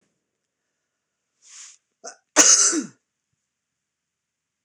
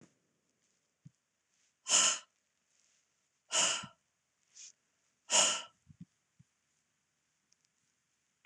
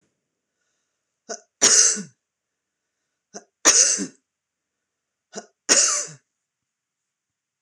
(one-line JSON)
{"cough_length": "4.6 s", "cough_amplitude": 26028, "cough_signal_mean_std_ratio": 0.25, "exhalation_length": "8.5 s", "exhalation_amplitude": 6541, "exhalation_signal_mean_std_ratio": 0.26, "three_cough_length": "7.6 s", "three_cough_amplitude": 26028, "three_cough_signal_mean_std_ratio": 0.3, "survey_phase": "beta (2021-08-13 to 2022-03-07)", "age": "45-64", "gender": "Female", "wearing_mask": "No", "symptom_none": true, "smoker_status": "Ex-smoker", "respiratory_condition_asthma": false, "respiratory_condition_other": false, "recruitment_source": "REACT", "submission_delay": "2 days", "covid_test_result": "Negative", "covid_test_method": "RT-qPCR", "influenza_a_test_result": "Negative", "influenza_b_test_result": "Negative"}